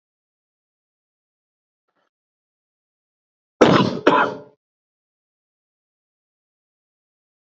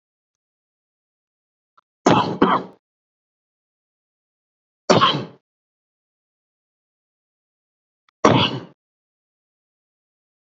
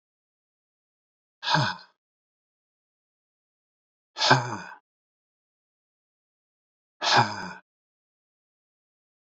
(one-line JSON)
{"cough_length": "7.4 s", "cough_amplitude": 28700, "cough_signal_mean_std_ratio": 0.21, "three_cough_length": "10.4 s", "three_cough_amplitude": 30887, "three_cough_signal_mean_std_ratio": 0.24, "exhalation_length": "9.2 s", "exhalation_amplitude": 25473, "exhalation_signal_mean_std_ratio": 0.24, "survey_phase": "beta (2021-08-13 to 2022-03-07)", "age": "45-64", "gender": "Male", "wearing_mask": "No", "symptom_none": true, "smoker_status": "Ex-smoker", "respiratory_condition_asthma": false, "respiratory_condition_other": false, "recruitment_source": "REACT", "submission_delay": "2 days", "covid_test_result": "Negative", "covid_test_method": "RT-qPCR", "influenza_a_test_result": "Negative", "influenza_b_test_result": "Negative"}